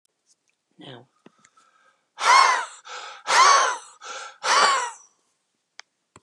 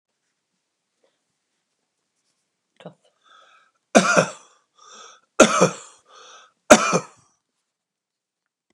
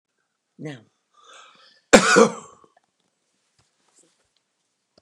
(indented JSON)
{
  "exhalation_length": "6.2 s",
  "exhalation_amplitude": 20604,
  "exhalation_signal_mean_std_ratio": 0.4,
  "three_cough_length": "8.7 s",
  "three_cough_amplitude": 32768,
  "three_cough_signal_mean_std_ratio": 0.23,
  "cough_length": "5.0 s",
  "cough_amplitude": 32768,
  "cough_signal_mean_std_ratio": 0.21,
  "survey_phase": "beta (2021-08-13 to 2022-03-07)",
  "age": "65+",
  "gender": "Male",
  "wearing_mask": "No",
  "symptom_none": true,
  "smoker_status": "Ex-smoker",
  "respiratory_condition_asthma": false,
  "respiratory_condition_other": false,
  "recruitment_source": "REACT",
  "submission_delay": "2 days",
  "covid_test_result": "Negative",
  "covid_test_method": "RT-qPCR",
  "influenza_a_test_result": "Negative",
  "influenza_b_test_result": "Negative"
}